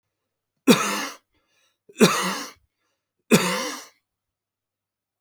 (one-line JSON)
{"three_cough_length": "5.2 s", "three_cough_amplitude": 29433, "three_cough_signal_mean_std_ratio": 0.32, "survey_phase": "alpha (2021-03-01 to 2021-08-12)", "age": "65+", "gender": "Male", "wearing_mask": "No", "symptom_none": true, "smoker_status": "Never smoked", "respiratory_condition_asthma": false, "respiratory_condition_other": false, "recruitment_source": "REACT", "submission_delay": "1 day", "covid_test_result": "Negative", "covid_test_method": "RT-qPCR"}